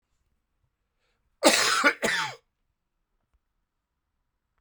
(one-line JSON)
{"cough_length": "4.6 s", "cough_amplitude": 19977, "cough_signal_mean_std_ratio": 0.31, "survey_phase": "alpha (2021-03-01 to 2021-08-12)", "age": "45-64", "gender": "Male", "wearing_mask": "No", "symptom_cough_any": true, "symptom_fever_high_temperature": true, "symptom_headache": true, "symptom_onset": "4 days", "smoker_status": "Ex-smoker", "respiratory_condition_asthma": false, "respiratory_condition_other": false, "recruitment_source": "Test and Trace", "submission_delay": "1 day", "covid_test_result": "Positive", "covid_test_method": "RT-qPCR", "covid_ct_value": 15.8, "covid_ct_gene": "ORF1ab gene", "covid_ct_mean": 16.4, "covid_viral_load": "4200000 copies/ml", "covid_viral_load_category": "High viral load (>1M copies/ml)"}